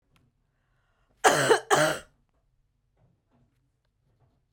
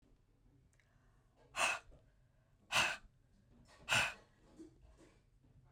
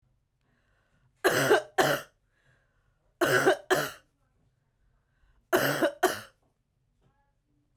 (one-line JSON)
{"cough_length": "4.5 s", "cough_amplitude": 18697, "cough_signal_mean_std_ratio": 0.28, "exhalation_length": "5.7 s", "exhalation_amplitude": 3913, "exhalation_signal_mean_std_ratio": 0.32, "three_cough_length": "7.8 s", "three_cough_amplitude": 13738, "three_cough_signal_mean_std_ratio": 0.36, "survey_phase": "beta (2021-08-13 to 2022-03-07)", "age": "45-64", "gender": "Male", "wearing_mask": "No", "symptom_cough_any": true, "symptom_runny_or_blocked_nose": true, "symptom_fever_high_temperature": true, "symptom_headache": true, "smoker_status": "Never smoked", "respiratory_condition_asthma": false, "respiratory_condition_other": false, "recruitment_source": "Test and Trace", "submission_delay": "2 days", "covid_test_result": "Positive", "covid_test_method": "RT-qPCR"}